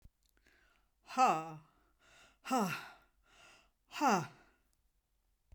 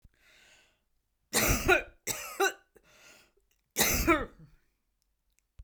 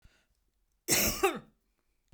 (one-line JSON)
{"exhalation_length": "5.5 s", "exhalation_amplitude": 4046, "exhalation_signal_mean_std_ratio": 0.34, "three_cough_length": "5.6 s", "three_cough_amplitude": 11135, "three_cough_signal_mean_std_ratio": 0.37, "cough_length": "2.1 s", "cough_amplitude": 9533, "cough_signal_mean_std_ratio": 0.36, "survey_phase": "beta (2021-08-13 to 2022-03-07)", "age": "65+", "gender": "Female", "wearing_mask": "No", "symptom_cough_any": true, "smoker_status": "Never smoked", "respiratory_condition_asthma": false, "respiratory_condition_other": false, "recruitment_source": "REACT", "submission_delay": "1 day", "covid_test_result": "Negative", "covid_test_method": "RT-qPCR"}